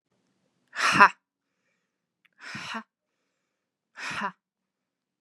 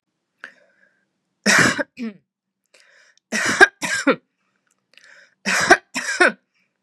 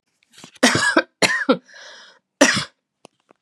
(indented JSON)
{
  "exhalation_length": "5.2 s",
  "exhalation_amplitude": 31167,
  "exhalation_signal_mean_std_ratio": 0.21,
  "three_cough_length": "6.8 s",
  "three_cough_amplitude": 32768,
  "three_cough_signal_mean_std_ratio": 0.34,
  "cough_length": "3.4 s",
  "cough_amplitude": 32768,
  "cough_signal_mean_std_ratio": 0.4,
  "survey_phase": "beta (2021-08-13 to 2022-03-07)",
  "age": "18-44",
  "gender": "Female",
  "wearing_mask": "No",
  "symptom_cough_any": true,
  "symptom_runny_or_blocked_nose": true,
  "symptom_onset": "4 days",
  "smoker_status": "Never smoked",
  "respiratory_condition_asthma": false,
  "respiratory_condition_other": false,
  "recruitment_source": "Test and Trace",
  "submission_delay": "1 day",
  "covid_test_result": "Positive",
  "covid_test_method": "RT-qPCR",
  "covid_ct_value": 25.8,
  "covid_ct_gene": "ORF1ab gene",
  "covid_ct_mean": 26.1,
  "covid_viral_load": "2700 copies/ml",
  "covid_viral_load_category": "Minimal viral load (< 10K copies/ml)"
}